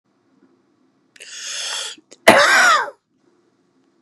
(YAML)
cough_length: 4.0 s
cough_amplitude: 32768
cough_signal_mean_std_ratio: 0.37
survey_phase: beta (2021-08-13 to 2022-03-07)
age: 65+
gender: Male
wearing_mask: 'No'
symptom_runny_or_blocked_nose: true
symptom_onset: 6 days
smoker_status: Never smoked
respiratory_condition_asthma: true
respiratory_condition_other: false
recruitment_source: REACT
submission_delay: 1 day
covid_test_result: Negative
covid_test_method: RT-qPCR
influenza_a_test_result: Negative
influenza_b_test_result: Negative